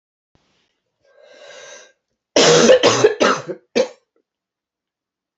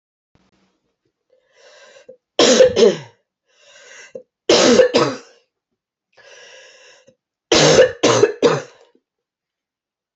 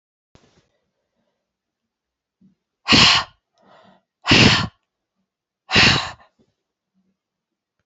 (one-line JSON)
{"cough_length": "5.4 s", "cough_amplitude": 29088, "cough_signal_mean_std_ratio": 0.36, "three_cough_length": "10.2 s", "three_cough_amplitude": 32768, "three_cough_signal_mean_std_ratio": 0.37, "exhalation_length": "7.9 s", "exhalation_amplitude": 31400, "exhalation_signal_mean_std_ratio": 0.29, "survey_phase": "beta (2021-08-13 to 2022-03-07)", "age": "45-64", "gender": "Female", "wearing_mask": "No", "symptom_cough_any": true, "symptom_runny_or_blocked_nose": true, "symptom_abdominal_pain": true, "symptom_fatigue": true, "symptom_fever_high_temperature": true, "symptom_headache": true, "symptom_onset": "4 days", "smoker_status": "Ex-smoker", "respiratory_condition_asthma": false, "respiratory_condition_other": false, "recruitment_source": "Test and Trace", "submission_delay": "1 day", "covid_test_result": "Positive", "covid_test_method": "RT-qPCR", "covid_ct_value": 17.5, "covid_ct_gene": "ORF1ab gene", "covid_ct_mean": 18.0, "covid_viral_load": "1300000 copies/ml", "covid_viral_load_category": "High viral load (>1M copies/ml)"}